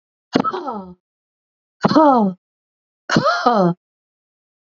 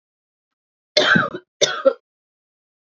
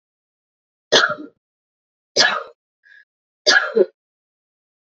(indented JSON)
{
  "exhalation_length": "4.7 s",
  "exhalation_amplitude": 32768,
  "exhalation_signal_mean_std_ratio": 0.42,
  "cough_length": "2.8 s",
  "cough_amplitude": 29679,
  "cough_signal_mean_std_ratio": 0.34,
  "three_cough_length": "4.9 s",
  "three_cough_amplitude": 30082,
  "three_cough_signal_mean_std_ratio": 0.3,
  "survey_phase": "beta (2021-08-13 to 2022-03-07)",
  "age": "18-44",
  "gender": "Female",
  "wearing_mask": "No",
  "symptom_cough_any": true,
  "symptom_runny_or_blocked_nose": true,
  "symptom_shortness_of_breath": true,
  "symptom_diarrhoea": true,
  "symptom_fatigue": true,
  "symptom_headache": true,
  "symptom_other": true,
  "symptom_onset": "3 days",
  "smoker_status": "Ex-smoker",
  "respiratory_condition_asthma": true,
  "respiratory_condition_other": false,
  "recruitment_source": "Test and Trace",
  "submission_delay": "2 days",
  "covid_test_result": "Positive",
  "covid_test_method": "RT-qPCR",
  "covid_ct_value": 22.2,
  "covid_ct_gene": "ORF1ab gene"
}